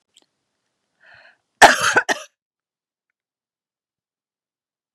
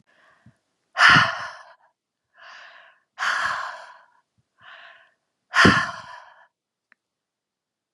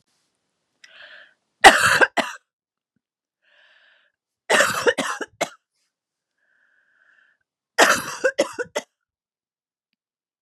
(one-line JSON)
{"cough_length": "4.9 s", "cough_amplitude": 32768, "cough_signal_mean_std_ratio": 0.19, "exhalation_length": "7.9 s", "exhalation_amplitude": 31088, "exhalation_signal_mean_std_ratio": 0.3, "three_cough_length": "10.4 s", "three_cough_amplitude": 32768, "three_cough_signal_mean_std_ratio": 0.27, "survey_phase": "beta (2021-08-13 to 2022-03-07)", "age": "45-64", "gender": "Female", "wearing_mask": "No", "symptom_cough_any": true, "symptom_abdominal_pain": true, "symptom_fatigue": true, "symptom_change_to_sense_of_smell_or_taste": true, "symptom_loss_of_taste": true, "symptom_onset": "4 days", "smoker_status": "Never smoked", "respiratory_condition_asthma": false, "respiratory_condition_other": false, "recruitment_source": "Test and Trace", "submission_delay": "2 days", "covid_test_result": "Positive", "covid_test_method": "RT-qPCR", "covid_ct_value": 11.1, "covid_ct_gene": "ORF1ab gene", "covid_ct_mean": 11.5, "covid_viral_load": "170000000 copies/ml", "covid_viral_load_category": "High viral load (>1M copies/ml)"}